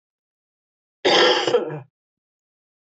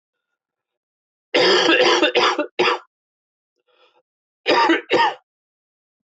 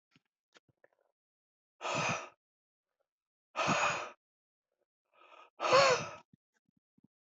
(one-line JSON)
{"cough_length": "2.8 s", "cough_amplitude": 18797, "cough_signal_mean_std_ratio": 0.39, "three_cough_length": "6.1 s", "three_cough_amplitude": 21749, "three_cough_signal_mean_std_ratio": 0.47, "exhalation_length": "7.3 s", "exhalation_amplitude": 7415, "exhalation_signal_mean_std_ratio": 0.32, "survey_phase": "beta (2021-08-13 to 2022-03-07)", "age": "18-44", "gender": "Male", "wearing_mask": "No", "symptom_cough_any": true, "symptom_runny_or_blocked_nose": true, "symptom_shortness_of_breath": true, "symptom_headache": true, "symptom_onset": "4 days", "smoker_status": "Ex-smoker", "respiratory_condition_asthma": false, "respiratory_condition_other": false, "recruitment_source": "Test and Trace", "submission_delay": "1 day", "covid_test_result": "Positive", "covid_test_method": "RT-qPCR", "covid_ct_value": 21.5, "covid_ct_gene": "ORF1ab gene"}